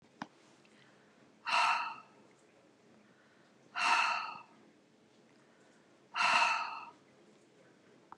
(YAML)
exhalation_length: 8.2 s
exhalation_amplitude: 6056
exhalation_signal_mean_std_ratio: 0.39
survey_phase: beta (2021-08-13 to 2022-03-07)
age: 65+
gender: Female
wearing_mask: 'No'
symptom_none: true
smoker_status: Never smoked
respiratory_condition_asthma: false
respiratory_condition_other: false
recruitment_source: REACT
submission_delay: 2 days
covid_test_result: Negative
covid_test_method: RT-qPCR
influenza_a_test_result: Negative
influenza_b_test_result: Negative